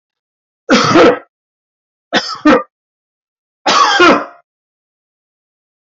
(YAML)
three_cough_length: 5.9 s
three_cough_amplitude: 30809
three_cough_signal_mean_std_ratio: 0.41
survey_phase: beta (2021-08-13 to 2022-03-07)
age: 65+
gender: Male
wearing_mask: 'No'
symptom_none: true
smoker_status: Ex-smoker
respiratory_condition_asthma: true
respiratory_condition_other: false
recruitment_source: REACT
submission_delay: 1 day
covid_test_result: Negative
covid_test_method: RT-qPCR